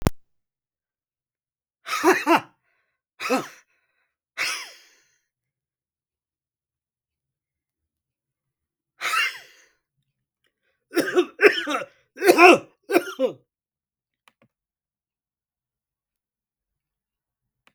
{"cough_length": "17.7 s", "cough_amplitude": 32768, "cough_signal_mean_std_ratio": 0.25, "survey_phase": "beta (2021-08-13 to 2022-03-07)", "age": "45-64", "gender": "Male", "wearing_mask": "No", "symptom_none": true, "smoker_status": "Never smoked", "respiratory_condition_asthma": false, "respiratory_condition_other": false, "recruitment_source": "REACT", "submission_delay": "0 days", "covid_test_result": "Negative", "covid_test_method": "RT-qPCR"}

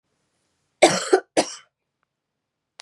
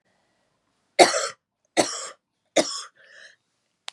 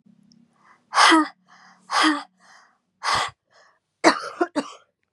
{"cough_length": "2.8 s", "cough_amplitude": 29790, "cough_signal_mean_std_ratio": 0.26, "three_cough_length": "3.9 s", "three_cough_amplitude": 32767, "three_cough_signal_mean_std_ratio": 0.27, "exhalation_length": "5.1 s", "exhalation_amplitude": 31495, "exhalation_signal_mean_std_ratio": 0.37, "survey_phase": "beta (2021-08-13 to 2022-03-07)", "age": "18-44", "gender": "Female", "wearing_mask": "No", "symptom_cough_any": true, "symptom_new_continuous_cough": true, "symptom_runny_or_blocked_nose": true, "symptom_shortness_of_breath": true, "symptom_fatigue": true, "symptom_fever_high_temperature": true, "symptom_headache": true, "symptom_other": true, "symptom_onset": "2 days", "smoker_status": "Never smoked", "respiratory_condition_asthma": false, "respiratory_condition_other": false, "recruitment_source": "Test and Trace", "submission_delay": "1 day", "covid_test_result": "Positive", "covid_test_method": "RT-qPCR", "covid_ct_value": 18.4, "covid_ct_gene": "N gene"}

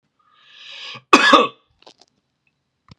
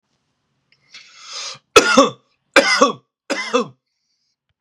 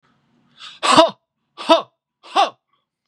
{"cough_length": "3.0 s", "cough_amplitude": 32768, "cough_signal_mean_std_ratio": 0.28, "three_cough_length": "4.6 s", "three_cough_amplitude": 32768, "three_cough_signal_mean_std_ratio": 0.34, "exhalation_length": "3.1 s", "exhalation_amplitude": 32767, "exhalation_signal_mean_std_ratio": 0.33, "survey_phase": "beta (2021-08-13 to 2022-03-07)", "age": "18-44", "gender": "Male", "wearing_mask": "No", "symptom_none": true, "smoker_status": "Ex-smoker", "respiratory_condition_asthma": false, "respiratory_condition_other": false, "recruitment_source": "REACT", "submission_delay": "2 days", "covid_test_result": "Negative", "covid_test_method": "RT-qPCR", "influenza_a_test_result": "Negative", "influenza_b_test_result": "Negative"}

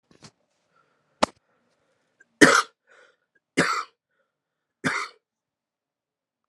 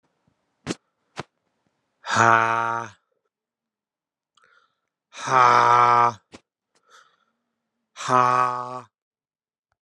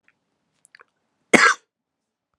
{"three_cough_length": "6.5 s", "three_cough_amplitude": 32767, "three_cough_signal_mean_std_ratio": 0.21, "exhalation_length": "9.8 s", "exhalation_amplitude": 26980, "exhalation_signal_mean_std_ratio": 0.34, "cough_length": "2.4 s", "cough_amplitude": 32767, "cough_signal_mean_std_ratio": 0.22, "survey_phase": "alpha (2021-03-01 to 2021-08-12)", "age": "18-44", "gender": "Male", "wearing_mask": "No", "symptom_cough_any": true, "symptom_shortness_of_breath": true, "symptom_fatigue": true, "symptom_fever_high_temperature": true, "symptom_headache": true, "symptom_onset": "2 days", "smoker_status": "Never smoked", "respiratory_condition_asthma": true, "respiratory_condition_other": false, "recruitment_source": "Test and Trace", "submission_delay": "2 days", "covid_test_result": "Positive", "covid_test_method": "RT-qPCR", "covid_ct_value": 23.7, "covid_ct_gene": "ORF1ab gene", "covid_ct_mean": 24.5, "covid_viral_load": "9200 copies/ml", "covid_viral_load_category": "Minimal viral load (< 10K copies/ml)"}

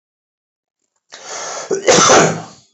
{"cough_length": "2.7 s", "cough_amplitude": 32768, "cough_signal_mean_std_ratio": 0.44, "survey_phase": "beta (2021-08-13 to 2022-03-07)", "age": "45-64", "gender": "Male", "wearing_mask": "No", "symptom_none": true, "smoker_status": "Ex-smoker", "respiratory_condition_asthma": false, "respiratory_condition_other": false, "recruitment_source": "REACT", "submission_delay": "2 days", "covid_test_result": "Negative", "covid_test_method": "RT-qPCR", "influenza_a_test_result": "Negative", "influenza_b_test_result": "Negative"}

